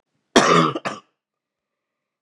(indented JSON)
{
  "cough_length": "2.2 s",
  "cough_amplitude": 32767,
  "cough_signal_mean_std_ratio": 0.34,
  "survey_phase": "beta (2021-08-13 to 2022-03-07)",
  "age": "45-64",
  "gender": "Male",
  "wearing_mask": "No",
  "symptom_fatigue": true,
  "symptom_headache": true,
  "smoker_status": "Current smoker (11 or more cigarettes per day)",
  "respiratory_condition_asthma": false,
  "respiratory_condition_other": false,
  "recruitment_source": "Test and Trace",
  "submission_delay": "1 day",
  "covid_test_result": "Positive",
  "covid_test_method": "RT-qPCR",
  "covid_ct_value": 34.7,
  "covid_ct_gene": "N gene"
}